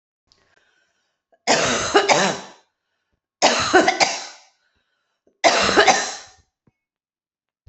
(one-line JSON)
{"three_cough_length": "7.7 s", "three_cough_amplitude": 30973, "three_cough_signal_mean_std_ratio": 0.42, "survey_phase": "beta (2021-08-13 to 2022-03-07)", "age": "45-64", "gender": "Female", "wearing_mask": "No", "symptom_cough_any": true, "symptom_runny_or_blocked_nose": true, "symptom_onset": "6 days", "smoker_status": "Never smoked", "respiratory_condition_asthma": false, "respiratory_condition_other": false, "recruitment_source": "REACT", "submission_delay": "2 days", "covid_test_result": "Negative", "covid_test_method": "RT-qPCR"}